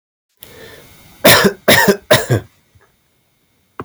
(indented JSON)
{
  "three_cough_length": "3.8 s",
  "three_cough_amplitude": 32768,
  "three_cough_signal_mean_std_ratio": 0.39,
  "survey_phase": "beta (2021-08-13 to 2022-03-07)",
  "age": "18-44",
  "gender": "Male",
  "wearing_mask": "No",
  "symptom_runny_or_blocked_nose": true,
  "symptom_fatigue": true,
  "symptom_headache": true,
  "symptom_change_to_sense_of_smell_or_taste": true,
  "smoker_status": "Never smoked",
  "respiratory_condition_asthma": false,
  "respiratory_condition_other": false,
  "recruitment_source": "Test and Trace",
  "submission_delay": "0 days",
  "covid_test_result": "Positive",
  "covid_test_method": "LFT"
}